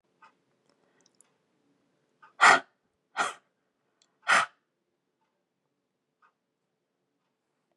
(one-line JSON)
{"exhalation_length": "7.8 s", "exhalation_amplitude": 23168, "exhalation_signal_mean_std_ratio": 0.18, "survey_phase": "beta (2021-08-13 to 2022-03-07)", "age": "45-64", "gender": "Female", "wearing_mask": "No", "symptom_fatigue": true, "smoker_status": "Never smoked", "respiratory_condition_asthma": false, "respiratory_condition_other": false, "recruitment_source": "REACT", "submission_delay": "5 days", "covid_test_result": "Negative", "covid_test_method": "RT-qPCR", "influenza_a_test_result": "Unknown/Void", "influenza_b_test_result": "Unknown/Void"}